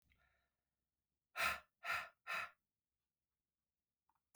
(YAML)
exhalation_length: 4.4 s
exhalation_amplitude: 1412
exhalation_signal_mean_std_ratio: 0.3
survey_phase: beta (2021-08-13 to 2022-03-07)
age: 18-44
gender: Male
wearing_mask: 'No'
symptom_cough_any: true
symptom_runny_or_blocked_nose: true
smoker_status: Ex-smoker
respiratory_condition_asthma: false
respiratory_condition_other: false
recruitment_source: REACT
submission_delay: 3 days
covid_test_result: Negative
covid_test_method: RT-qPCR
covid_ct_value: 38.0
covid_ct_gene: N gene
influenza_a_test_result: Negative
influenza_b_test_result: Negative